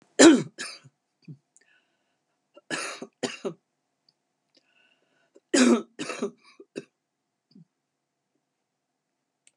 {"three_cough_length": "9.6 s", "three_cough_amplitude": 28436, "three_cough_signal_mean_std_ratio": 0.22, "survey_phase": "beta (2021-08-13 to 2022-03-07)", "age": "65+", "gender": "Female", "wearing_mask": "No", "symptom_cough_any": true, "smoker_status": "Never smoked", "respiratory_condition_asthma": false, "respiratory_condition_other": false, "recruitment_source": "REACT", "submission_delay": "2 days", "covid_test_result": "Negative", "covid_test_method": "RT-qPCR", "influenza_a_test_result": "Negative", "influenza_b_test_result": "Negative"}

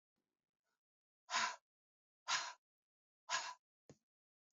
{"exhalation_length": "4.5 s", "exhalation_amplitude": 2171, "exhalation_signal_mean_std_ratio": 0.3, "survey_phase": "beta (2021-08-13 to 2022-03-07)", "age": "45-64", "gender": "Female", "wearing_mask": "No", "symptom_none": true, "smoker_status": "Never smoked", "respiratory_condition_asthma": false, "respiratory_condition_other": false, "recruitment_source": "REACT", "submission_delay": "2 days", "covid_test_method": "RT-qPCR", "influenza_a_test_result": "Unknown/Void", "influenza_b_test_result": "Unknown/Void"}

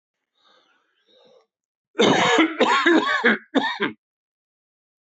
{"cough_length": "5.1 s", "cough_amplitude": 18679, "cough_signal_mean_std_ratio": 0.46, "survey_phase": "beta (2021-08-13 to 2022-03-07)", "age": "65+", "gender": "Male", "wearing_mask": "No", "symptom_none": true, "smoker_status": "Ex-smoker", "respiratory_condition_asthma": false, "respiratory_condition_other": false, "recruitment_source": "REACT", "submission_delay": "1 day", "covid_test_result": "Negative", "covid_test_method": "RT-qPCR"}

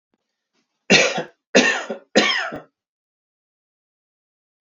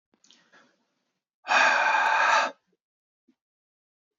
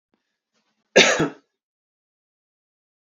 {"three_cough_length": "4.6 s", "three_cough_amplitude": 30989, "three_cough_signal_mean_std_ratio": 0.34, "exhalation_length": "4.2 s", "exhalation_amplitude": 12732, "exhalation_signal_mean_std_ratio": 0.42, "cough_length": "3.2 s", "cough_amplitude": 30086, "cough_signal_mean_std_ratio": 0.23, "survey_phase": "beta (2021-08-13 to 2022-03-07)", "age": "18-44", "gender": "Male", "wearing_mask": "No", "symptom_none": true, "smoker_status": "Ex-smoker", "respiratory_condition_asthma": false, "respiratory_condition_other": false, "recruitment_source": "REACT", "submission_delay": "2 days", "covid_test_result": "Negative", "covid_test_method": "RT-qPCR"}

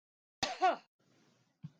{"cough_length": "1.8 s", "cough_amplitude": 3959, "cough_signal_mean_std_ratio": 0.31, "survey_phase": "beta (2021-08-13 to 2022-03-07)", "age": "45-64", "gender": "Female", "wearing_mask": "No", "symptom_none": true, "smoker_status": "Never smoked", "respiratory_condition_asthma": false, "respiratory_condition_other": false, "recruitment_source": "REACT", "submission_delay": "2 days", "covid_test_result": "Negative", "covid_test_method": "RT-qPCR", "influenza_a_test_result": "Negative", "influenza_b_test_result": "Negative"}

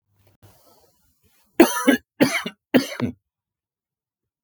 {"cough_length": "4.4 s", "cough_amplitude": 32768, "cough_signal_mean_std_ratio": 0.29, "survey_phase": "beta (2021-08-13 to 2022-03-07)", "age": "45-64", "gender": "Male", "wearing_mask": "No", "symptom_none": true, "smoker_status": "Ex-smoker", "respiratory_condition_asthma": false, "respiratory_condition_other": false, "recruitment_source": "REACT", "submission_delay": "2 days", "covid_test_result": "Negative", "covid_test_method": "RT-qPCR", "influenza_a_test_result": "Negative", "influenza_b_test_result": "Negative"}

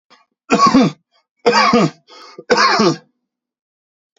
{"three_cough_length": "4.2 s", "three_cough_amplitude": 30512, "three_cough_signal_mean_std_ratio": 0.48, "survey_phase": "beta (2021-08-13 to 2022-03-07)", "age": "45-64", "gender": "Male", "wearing_mask": "No", "symptom_none": true, "smoker_status": "Ex-smoker", "respiratory_condition_asthma": false, "respiratory_condition_other": false, "recruitment_source": "REACT", "submission_delay": "1 day", "covid_test_result": "Negative", "covid_test_method": "RT-qPCR", "influenza_a_test_result": "Negative", "influenza_b_test_result": "Negative"}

